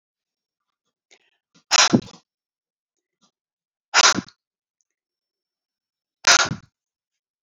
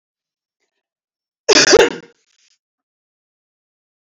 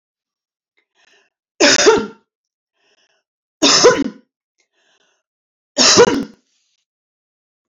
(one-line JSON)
{"exhalation_length": "7.4 s", "exhalation_amplitude": 30775, "exhalation_signal_mean_std_ratio": 0.23, "cough_length": "4.1 s", "cough_amplitude": 31051, "cough_signal_mean_std_ratio": 0.25, "three_cough_length": "7.7 s", "three_cough_amplitude": 32309, "three_cough_signal_mean_std_ratio": 0.33, "survey_phase": "beta (2021-08-13 to 2022-03-07)", "age": "45-64", "gender": "Female", "wearing_mask": "No", "symptom_none": true, "smoker_status": "Never smoked", "respiratory_condition_asthma": false, "respiratory_condition_other": false, "recruitment_source": "REACT", "submission_delay": "2 days", "covid_test_result": "Negative", "covid_test_method": "RT-qPCR", "influenza_a_test_result": "Negative", "influenza_b_test_result": "Negative"}